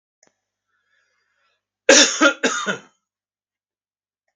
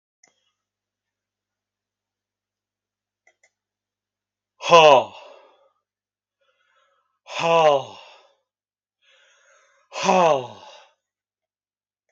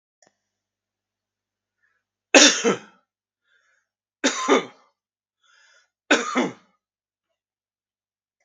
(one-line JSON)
{"cough_length": "4.4 s", "cough_amplitude": 32767, "cough_signal_mean_std_ratio": 0.28, "exhalation_length": "12.1 s", "exhalation_amplitude": 32767, "exhalation_signal_mean_std_ratio": 0.24, "three_cough_length": "8.4 s", "three_cough_amplitude": 32767, "three_cough_signal_mean_std_ratio": 0.24, "survey_phase": "beta (2021-08-13 to 2022-03-07)", "age": "65+", "gender": "Male", "wearing_mask": "No", "symptom_none": true, "smoker_status": "Ex-smoker", "respiratory_condition_asthma": false, "respiratory_condition_other": false, "recruitment_source": "REACT", "submission_delay": "2 days", "covid_test_result": "Negative", "covid_test_method": "RT-qPCR", "influenza_a_test_result": "Negative", "influenza_b_test_result": "Negative"}